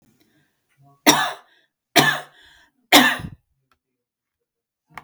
three_cough_length: 5.0 s
three_cough_amplitude: 32768
three_cough_signal_mean_std_ratio: 0.28
survey_phase: beta (2021-08-13 to 2022-03-07)
age: 45-64
gender: Female
wearing_mask: 'No'
symptom_none: true
smoker_status: Never smoked
respiratory_condition_asthma: false
respiratory_condition_other: false
recruitment_source: REACT
submission_delay: 2 days
covid_test_result: Negative
covid_test_method: RT-qPCR
influenza_a_test_result: Negative
influenza_b_test_result: Negative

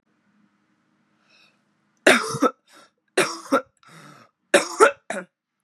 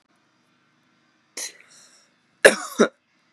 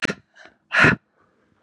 three_cough_length: 5.6 s
three_cough_amplitude: 32767
three_cough_signal_mean_std_ratio: 0.29
cough_length: 3.3 s
cough_amplitude: 32768
cough_signal_mean_std_ratio: 0.19
exhalation_length: 1.6 s
exhalation_amplitude: 27242
exhalation_signal_mean_std_ratio: 0.33
survey_phase: beta (2021-08-13 to 2022-03-07)
age: 45-64
gender: Female
wearing_mask: 'No'
symptom_cough_any: true
symptom_sore_throat: true
symptom_fatigue: true
symptom_fever_high_temperature: true
symptom_onset: 5 days
smoker_status: Ex-smoker
respiratory_condition_asthma: false
respiratory_condition_other: false
recruitment_source: Test and Trace
submission_delay: 2 days
covid_test_result: Positive
covid_test_method: RT-qPCR
covid_ct_value: 16.5
covid_ct_gene: ORF1ab gene
covid_ct_mean: 16.9
covid_viral_load: 2800000 copies/ml
covid_viral_load_category: High viral load (>1M copies/ml)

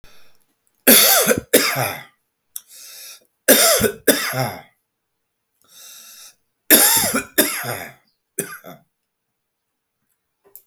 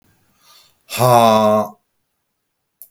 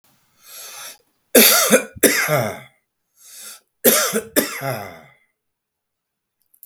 three_cough_length: 10.7 s
three_cough_amplitude: 32768
three_cough_signal_mean_std_ratio: 0.39
exhalation_length: 2.9 s
exhalation_amplitude: 32766
exhalation_signal_mean_std_ratio: 0.4
cough_length: 6.7 s
cough_amplitude: 32768
cough_signal_mean_std_ratio: 0.39
survey_phase: beta (2021-08-13 to 2022-03-07)
age: 45-64
gender: Male
wearing_mask: 'No'
symptom_headache: true
smoker_status: Never smoked
respiratory_condition_asthma: false
respiratory_condition_other: false
recruitment_source: Test and Trace
submission_delay: 2 days
covid_test_result: Negative
covid_test_method: ePCR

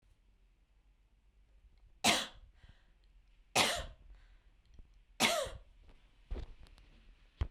three_cough_length: 7.5 s
three_cough_amplitude: 6488
three_cough_signal_mean_std_ratio: 0.33
survey_phase: beta (2021-08-13 to 2022-03-07)
age: 45-64
gender: Female
wearing_mask: 'No'
symptom_none: true
smoker_status: Never smoked
respiratory_condition_asthma: false
respiratory_condition_other: false
recruitment_source: REACT
submission_delay: 0 days
covid_test_result: Negative
covid_test_method: RT-qPCR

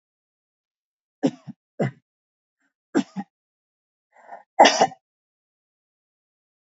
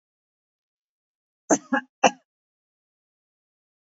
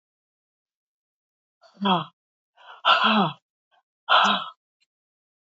three_cough_length: 6.7 s
three_cough_amplitude: 27172
three_cough_signal_mean_std_ratio: 0.2
cough_length: 3.9 s
cough_amplitude: 25036
cough_signal_mean_std_ratio: 0.17
exhalation_length: 5.5 s
exhalation_amplitude: 19143
exhalation_signal_mean_std_ratio: 0.34
survey_phase: alpha (2021-03-01 to 2021-08-12)
age: 65+
gender: Female
wearing_mask: 'No'
symptom_none: true
smoker_status: Ex-smoker
respiratory_condition_asthma: false
respiratory_condition_other: false
recruitment_source: REACT
submission_delay: 3 days
covid_test_result: Negative
covid_test_method: RT-qPCR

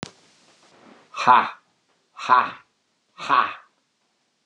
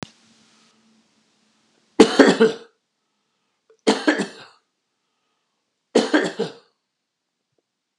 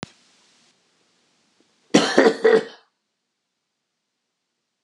exhalation_length: 4.5 s
exhalation_amplitude: 29237
exhalation_signal_mean_std_ratio: 0.31
three_cough_length: 8.0 s
three_cough_amplitude: 32768
three_cough_signal_mean_std_ratio: 0.27
cough_length: 4.8 s
cough_amplitude: 31961
cough_signal_mean_std_ratio: 0.27
survey_phase: beta (2021-08-13 to 2022-03-07)
age: 65+
gender: Male
wearing_mask: 'No'
symptom_none: true
smoker_status: Never smoked
respiratory_condition_asthma: false
respiratory_condition_other: false
recruitment_source: REACT
submission_delay: 2 days
covid_test_result: Negative
covid_test_method: RT-qPCR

